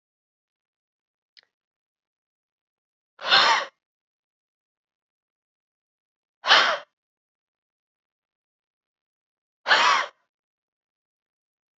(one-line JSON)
{"exhalation_length": "11.8 s", "exhalation_amplitude": 24410, "exhalation_signal_mean_std_ratio": 0.23, "survey_phase": "beta (2021-08-13 to 2022-03-07)", "age": "18-44", "gender": "Female", "wearing_mask": "No", "symptom_runny_or_blocked_nose": true, "smoker_status": "Never smoked", "respiratory_condition_asthma": false, "respiratory_condition_other": false, "recruitment_source": "Test and Trace", "submission_delay": "1 day", "covid_test_result": "Positive", "covid_test_method": "RT-qPCR", "covid_ct_value": 23.7, "covid_ct_gene": "ORF1ab gene", "covid_ct_mean": 24.6, "covid_viral_load": "8300 copies/ml", "covid_viral_load_category": "Minimal viral load (< 10K copies/ml)"}